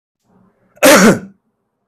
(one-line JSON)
{"cough_length": "1.9 s", "cough_amplitude": 32768, "cough_signal_mean_std_ratio": 0.39, "survey_phase": "beta (2021-08-13 to 2022-03-07)", "age": "45-64", "gender": "Male", "wearing_mask": "No", "symptom_none": true, "smoker_status": "Never smoked", "respiratory_condition_asthma": false, "respiratory_condition_other": false, "recruitment_source": "REACT", "submission_delay": "15 days", "covid_test_result": "Negative", "covid_test_method": "RT-qPCR", "influenza_a_test_result": "Negative", "influenza_b_test_result": "Negative"}